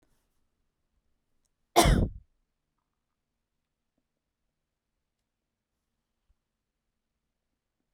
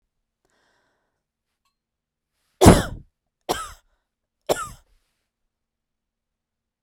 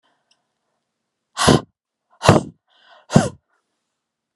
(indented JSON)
{
  "cough_length": "7.9 s",
  "cough_amplitude": 17506,
  "cough_signal_mean_std_ratio": 0.16,
  "three_cough_length": "6.8 s",
  "three_cough_amplitude": 32768,
  "three_cough_signal_mean_std_ratio": 0.17,
  "exhalation_length": "4.4 s",
  "exhalation_amplitude": 32768,
  "exhalation_signal_mean_std_ratio": 0.25,
  "survey_phase": "beta (2021-08-13 to 2022-03-07)",
  "age": "45-64",
  "gender": "Female",
  "wearing_mask": "No",
  "symptom_none": true,
  "smoker_status": "Never smoked",
  "respiratory_condition_asthma": false,
  "respiratory_condition_other": false,
  "recruitment_source": "REACT",
  "submission_delay": "4 days",
  "covid_test_result": "Negative",
  "covid_test_method": "RT-qPCR"
}